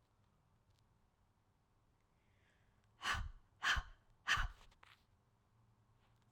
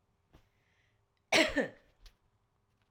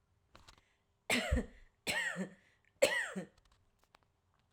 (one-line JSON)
{"exhalation_length": "6.3 s", "exhalation_amplitude": 2468, "exhalation_signal_mean_std_ratio": 0.29, "cough_length": "2.9 s", "cough_amplitude": 7983, "cough_signal_mean_std_ratio": 0.26, "three_cough_length": "4.5 s", "three_cough_amplitude": 6958, "three_cough_signal_mean_std_ratio": 0.39, "survey_phase": "alpha (2021-03-01 to 2021-08-12)", "age": "45-64", "gender": "Female", "wearing_mask": "No", "symptom_none": true, "smoker_status": "Never smoked", "respiratory_condition_asthma": false, "respiratory_condition_other": false, "recruitment_source": "REACT", "submission_delay": "2 days", "covid_test_result": "Negative", "covid_test_method": "RT-qPCR"}